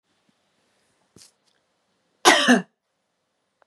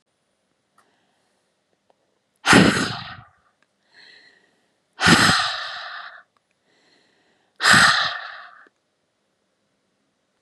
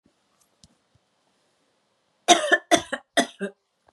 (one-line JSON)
{"cough_length": "3.7 s", "cough_amplitude": 32767, "cough_signal_mean_std_ratio": 0.23, "exhalation_length": "10.4 s", "exhalation_amplitude": 31090, "exhalation_signal_mean_std_ratio": 0.32, "three_cough_length": "3.9 s", "three_cough_amplitude": 30876, "three_cough_signal_mean_std_ratio": 0.26, "survey_phase": "beta (2021-08-13 to 2022-03-07)", "age": "18-44", "gender": "Female", "wearing_mask": "No", "symptom_headache": true, "smoker_status": "Never smoked", "respiratory_condition_asthma": false, "respiratory_condition_other": false, "recruitment_source": "REACT", "submission_delay": "2 days", "covid_test_result": "Negative", "covid_test_method": "RT-qPCR", "influenza_a_test_result": "Negative", "influenza_b_test_result": "Negative"}